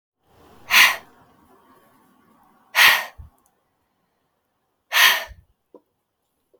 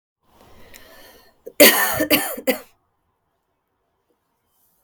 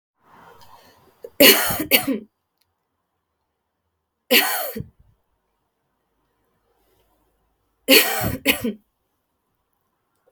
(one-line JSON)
{"exhalation_length": "6.6 s", "exhalation_amplitude": 32587, "exhalation_signal_mean_std_ratio": 0.28, "cough_length": "4.8 s", "cough_amplitude": 32768, "cough_signal_mean_std_ratio": 0.28, "three_cough_length": "10.3 s", "three_cough_amplitude": 32768, "three_cough_signal_mean_std_ratio": 0.29, "survey_phase": "beta (2021-08-13 to 2022-03-07)", "age": "18-44", "gender": "Female", "wearing_mask": "No", "symptom_cough_any": true, "symptom_new_continuous_cough": true, "symptom_runny_or_blocked_nose": true, "symptom_sore_throat": true, "symptom_diarrhoea": true, "symptom_headache": true, "symptom_onset": "3 days", "smoker_status": "Never smoked", "respiratory_condition_asthma": false, "respiratory_condition_other": false, "recruitment_source": "Test and Trace", "submission_delay": "1 day", "covid_test_result": "Positive", "covid_test_method": "RT-qPCR", "covid_ct_value": 18.4, "covid_ct_gene": "ORF1ab gene", "covid_ct_mean": 18.7, "covid_viral_load": "710000 copies/ml", "covid_viral_load_category": "Low viral load (10K-1M copies/ml)"}